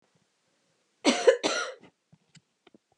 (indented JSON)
{
  "cough_length": "3.0 s",
  "cough_amplitude": 16123,
  "cough_signal_mean_std_ratio": 0.29,
  "survey_phase": "beta (2021-08-13 to 2022-03-07)",
  "age": "45-64",
  "gender": "Female",
  "wearing_mask": "No",
  "symptom_cough_any": true,
  "symptom_shortness_of_breath": true,
  "symptom_sore_throat": true,
  "symptom_fever_high_temperature": true,
  "symptom_change_to_sense_of_smell_or_taste": true,
  "symptom_loss_of_taste": true,
  "symptom_onset": "3 days",
  "smoker_status": "Never smoked",
  "respiratory_condition_asthma": true,
  "respiratory_condition_other": false,
  "recruitment_source": "Test and Trace",
  "submission_delay": "1 day",
  "covid_test_result": "Positive",
  "covid_test_method": "LAMP"
}